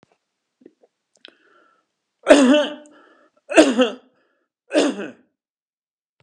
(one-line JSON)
{"three_cough_length": "6.2 s", "three_cough_amplitude": 32768, "three_cough_signal_mean_std_ratio": 0.31, "survey_phase": "beta (2021-08-13 to 2022-03-07)", "age": "65+", "gender": "Male", "wearing_mask": "No", "symptom_cough_any": true, "symptom_runny_or_blocked_nose": true, "symptom_onset": "13 days", "smoker_status": "Never smoked", "respiratory_condition_asthma": false, "respiratory_condition_other": false, "recruitment_source": "REACT", "submission_delay": "1 day", "covid_test_result": "Negative", "covid_test_method": "RT-qPCR", "covid_ct_value": 38.0, "covid_ct_gene": "N gene", "influenza_a_test_result": "Negative", "influenza_b_test_result": "Negative"}